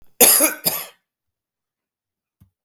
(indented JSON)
{
  "cough_length": "2.6 s",
  "cough_amplitude": 32768,
  "cough_signal_mean_std_ratio": 0.31,
  "survey_phase": "beta (2021-08-13 to 2022-03-07)",
  "age": "45-64",
  "gender": "Male",
  "wearing_mask": "No",
  "symptom_runny_or_blocked_nose": true,
  "symptom_fatigue": true,
  "symptom_change_to_sense_of_smell_or_taste": true,
  "smoker_status": "Ex-smoker",
  "respiratory_condition_asthma": true,
  "respiratory_condition_other": false,
  "recruitment_source": "Test and Trace",
  "submission_delay": "0 days",
  "covid_test_result": "Positive",
  "covid_test_method": "LFT"
}